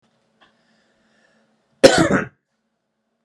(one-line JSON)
{"cough_length": "3.2 s", "cough_amplitude": 32768, "cough_signal_mean_std_ratio": 0.24, "survey_phase": "beta (2021-08-13 to 2022-03-07)", "age": "18-44", "gender": "Male", "wearing_mask": "No", "symptom_none": true, "smoker_status": "Ex-smoker", "respiratory_condition_asthma": false, "respiratory_condition_other": false, "recruitment_source": "REACT", "submission_delay": "1 day", "covid_test_result": "Negative", "covid_test_method": "RT-qPCR"}